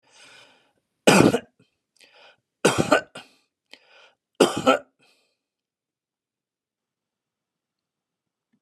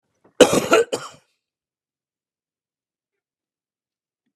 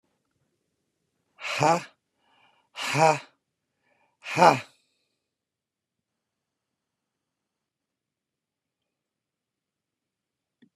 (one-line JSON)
{"three_cough_length": "8.6 s", "three_cough_amplitude": 32579, "three_cough_signal_mean_std_ratio": 0.24, "cough_length": "4.4 s", "cough_amplitude": 32768, "cough_signal_mean_std_ratio": 0.22, "exhalation_length": "10.8 s", "exhalation_amplitude": 23708, "exhalation_signal_mean_std_ratio": 0.2, "survey_phase": "beta (2021-08-13 to 2022-03-07)", "age": "45-64", "gender": "Male", "wearing_mask": "No", "symptom_none": true, "smoker_status": "Never smoked", "respiratory_condition_asthma": false, "respiratory_condition_other": false, "recruitment_source": "REACT", "submission_delay": "2 days", "covid_test_result": "Negative", "covid_test_method": "RT-qPCR", "influenza_a_test_result": "Negative", "influenza_b_test_result": "Negative"}